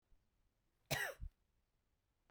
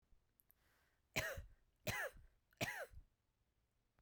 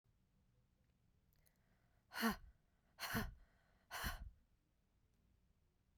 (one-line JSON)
{"cough_length": "2.3 s", "cough_amplitude": 1728, "cough_signal_mean_std_ratio": 0.29, "three_cough_length": "4.0 s", "three_cough_amplitude": 1498, "three_cough_signal_mean_std_ratio": 0.38, "exhalation_length": "6.0 s", "exhalation_amplitude": 1523, "exhalation_signal_mean_std_ratio": 0.32, "survey_phase": "beta (2021-08-13 to 2022-03-07)", "age": "45-64", "gender": "Female", "wearing_mask": "No", "symptom_cough_any": true, "symptom_runny_or_blocked_nose": true, "symptom_fatigue": true, "symptom_headache": true, "smoker_status": "Ex-smoker", "respiratory_condition_asthma": false, "respiratory_condition_other": false, "recruitment_source": "Test and Trace", "submission_delay": "2 days", "covid_test_result": "Positive", "covid_test_method": "LFT"}